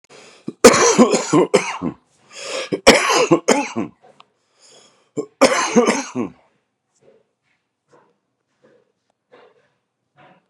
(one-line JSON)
{"three_cough_length": "10.5 s", "three_cough_amplitude": 32768, "three_cough_signal_mean_std_ratio": 0.37, "survey_phase": "beta (2021-08-13 to 2022-03-07)", "age": "45-64", "gender": "Male", "wearing_mask": "No", "symptom_cough_any": true, "symptom_runny_or_blocked_nose": true, "symptom_shortness_of_breath": true, "symptom_sore_throat": true, "symptom_abdominal_pain": true, "symptom_fatigue": true, "symptom_onset": "5 days", "smoker_status": "Never smoked", "respiratory_condition_asthma": false, "respiratory_condition_other": false, "recruitment_source": "REACT", "submission_delay": "5 days", "covid_test_result": "Positive", "covid_test_method": "RT-qPCR", "covid_ct_value": 27.6, "covid_ct_gene": "E gene", "influenza_a_test_result": "Negative", "influenza_b_test_result": "Negative"}